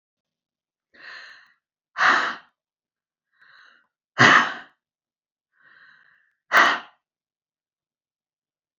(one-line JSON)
{"exhalation_length": "8.8 s", "exhalation_amplitude": 29099, "exhalation_signal_mean_std_ratio": 0.25, "survey_phase": "beta (2021-08-13 to 2022-03-07)", "age": "65+", "gender": "Female", "wearing_mask": "No", "symptom_none": true, "smoker_status": "Never smoked", "respiratory_condition_asthma": false, "respiratory_condition_other": false, "recruitment_source": "REACT", "submission_delay": "1 day", "covid_test_result": "Negative", "covid_test_method": "RT-qPCR", "influenza_a_test_result": "Negative", "influenza_b_test_result": "Negative"}